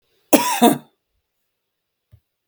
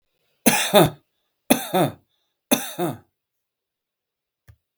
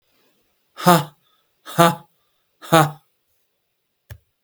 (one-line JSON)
{"cough_length": "2.5 s", "cough_amplitude": 32768, "cough_signal_mean_std_ratio": 0.28, "three_cough_length": "4.8 s", "three_cough_amplitude": 32768, "three_cough_signal_mean_std_ratio": 0.33, "exhalation_length": "4.4 s", "exhalation_amplitude": 32768, "exhalation_signal_mean_std_ratio": 0.27, "survey_phase": "beta (2021-08-13 to 2022-03-07)", "age": "45-64", "gender": "Male", "wearing_mask": "No", "symptom_none": true, "symptom_onset": "12 days", "smoker_status": "Never smoked", "respiratory_condition_asthma": false, "respiratory_condition_other": false, "recruitment_source": "REACT", "submission_delay": "1 day", "covid_test_result": "Negative", "covid_test_method": "RT-qPCR", "influenza_a_test_result": "Negative", "influenza_b_test_result": "Negative"}